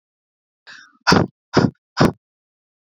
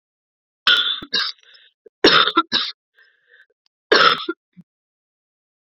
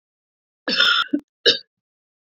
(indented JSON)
{
  "exhalation_length": "3.0 s",
  "exhalation_amplitude": 27750,
  "exhalation_signal_mean_std_ratio": 0.3,
  "three_cough_length": "5.7 s",
  "three_cough_amplitude": 32767,
  "three_cough_signal_mean_std_ratio": 0.36,
  "cough_length": "2.3 s",
  "cough_amplitude": 27984,
  "cough_signal_mean_std_ratio": 0.38,
  "survey_phase": "beta (2021-08-13 to 2022-03-07)",
  "age": "45-64",
  "gender": "Female",
  "wearing_mask": "No",
  "symptom_cough_any": true,
  "symptom_runny_or_blocked_nose": true,
  "symptom_sore_throat": true,
  "symptom_fatigue": true,
  "symptom_headache": true,
  "symptom_change_to_sense_of_smell_or_taste": true,
  "symptom_loss_of_taste": true,
  "smoker_status": "Ex-smoker",
  "respiratory_condition_asthma": false,
  "respiratory_condition_other": false,
  "recruitment_source": "Test and Trace",
  "submission_delay": "3 days",
  "covid_test_result": "Positive",
  "covid_test_method": "ePCR"
}